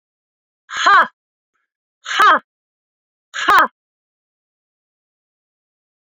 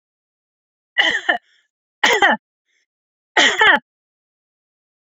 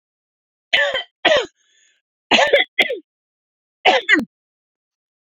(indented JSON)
{
  "exhalation_length": "6.1 s",
  "exhalation_amplitude": 27791,
  "exhalation_signal_mean_std_ratio": 0.29,
  "cough_length": "5.1 s",
  "cough_amplitude": 32767,
  "cough_signal_mean_std_ratio": 0.35,
  "three_cough_length": "5.2 s",
  "three_cough_amplitude": 28475,
  "three_cough_signal_mean_std_ratio": 0.38,
  "survey_phase": "alpha (2021-03-01 to 2021-08-12)",
  "age": "45-64",
  "gender": "Female",
  "wearing_mask": "No",
  "symptom_none": true,
  "smoker_status": "Never smoked",
  "respiratory_condition_asthma": true,
  "respiratory_condition_other": false,
  "recruitment_source": "Test and Trace",
  "submission_delay": "0 days",
  "covid_test_result": "Negative",
  "covid_test_method": "LFT"
}